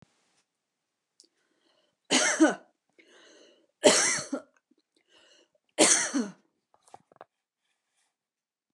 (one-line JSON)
{"three_cough_length": "8.7 s", "three_cough_amplitude": 19124, "three_cough_signal_mean_std_ratio": 0.29, "survey_phase": "beta (2021-08-13 to 2022-03-07)", "age": "65+", "gender": "Female", "wearing_mask": "No", "symptom_runny_or_blocked_nose": true, "symptom_abdominal_pain": true, "symptom_onset": "12 days", "smoker_status": "Never smoked", "respiratory_condition_asthma": false, "respiratory_condition_other": false, "recruitment_source": "REACT", "submission_delay": "1 day", "covid_test_result": "Negative", "covid_test_method": "RT-qPCR", "influenza_a_test_result": "Negative", "influenza_b_test_result": "Negative"}